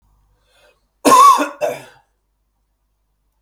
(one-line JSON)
{"cough_length": "3.4 s", "cough_amplitude": 32768, "cough_signal_mean_std_ratio": 0.32, "survey_phase": "beta (2021-08-13 to 2022-03-07)", "age": "45-64", "gender": "Male", "wearing_mask": "No", "symptom_none": true, "smoker_status": "Ex-smoker", "respiratory_condition_asthma": false, "respiratory_condition_other": false, "recruitment_source": "REACT", "submission_delay": "3 days", "covid_test_result": "Negative", "covid_test_method": "RT-qPCR", "influenza_a_test_result": "Negative", "influenza_b_test_result": "Negative"}